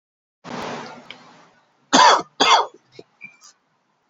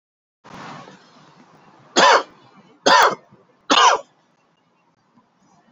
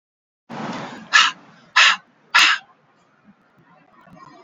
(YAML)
cough_length: 4.1 s
cough_amplitude: 31091
cough_signal_mean_std_ratio: 0.33
three_cough_length: 5.7 s
three_cough_amplitude: 30419
three_cough_signal_mean_std_ratio: 0.32
exhalation_length: 4.4 s
exhalation_amplitude: 29723
exhalation_signal_mean_std_ratio: 0.34
survey_phase: alpha (2021-03-01 to 2021-08-12)
age: 45-64
gender: Male
wearing_mask: 'No'
symptom_cough_any: true
symptom_onset: 12 days
smoker_status: Ex-smoker
respiratory_condition_asthma: false
respiratory_condition_other: false
recruitment_source: REACT
submission_delay: 4 days
covid_test_result: Negative
covid_test_method: RT-qPCR